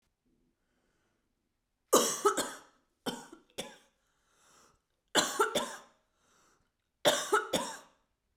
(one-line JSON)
{"three_cough_length": "8.4 s", "three_cough_amplitude": 9193, "three_cough_signal_mean_std_ratio": 0.33, "survey_phase": "beta (2021-08-13 to 2022-03-07)", "age": "18-44", "gender": "Female", "wearing_mask": "No", "symptom_cough_any": true, "symptom_new_continuous_cough": true, "symptom_sore_throat": true, "symptom_change_to_sense_of_smell_or_taste": true, "smoker_status": "Never smoked", "respiratory_condition_asthma": false, "respiratory_condition_other": false, "recruitment_source": "Test and Trace", "submission_delay": "1 day", "covid_test_result": "Negative", "covid_test_method": "RT-qPCR"}